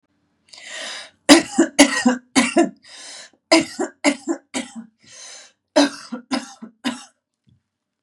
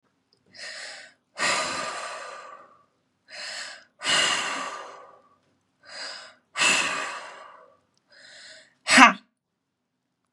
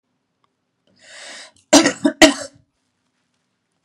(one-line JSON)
{"three_cough_length": "8.0 s", "three_cough_amplitude": 32768, "three_cough_signal_mean_std_ratio": 0.36, "exhalation_length": "10.3 s", "exhalation_amplitude": 32767, "exhalation_signal_mean_std_ratio": 0.35, "cough_length": "3.8 s", "cough_amplitude": 32768, "cough_signal_mean_std_ratio": 0.25, "survey_phase": "beta (2021-08-13 to 2022-03-07)", "age": "18-44", "gender": "Female", "wearing_mask": "No", "symptom_fatigue": true, "smoker_status": "Current smoker (11 or more cigarettes per day)", "respiratory_condition_asthma": true, "respiratory_condition_other": false, "recruitment_source": "REACT", "submission_delay": "1 day", "covid_test_result": "Negative", "covid_test_method": "RT-qPCR"}